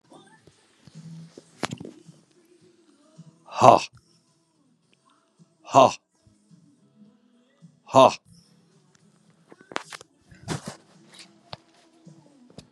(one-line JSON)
{"exhalation_length": "12.7 s", "exhalation_amplitude": 32768, "exhalation_signal_mean_std_ratio": 0.19, "survey_phase": "beta (2021-08-13 to 2022-03-07)", "age": "65+", "gender": "Male", "wearing_mask": "No", "symptom_none": true, "smoker_status": "Current smoker (11 or more cigarettes per day)", "respiratory_condition_asthma": false, "respiratory_condition_other": false, "recruitment_source": "REACT", "submission_delay": "3 days", "covid_test_result": "Negative", "covid_test_method": "RT-qPCR", "influenza_a_test_result": "Negative", "influenza_b_test_result": "Negative"}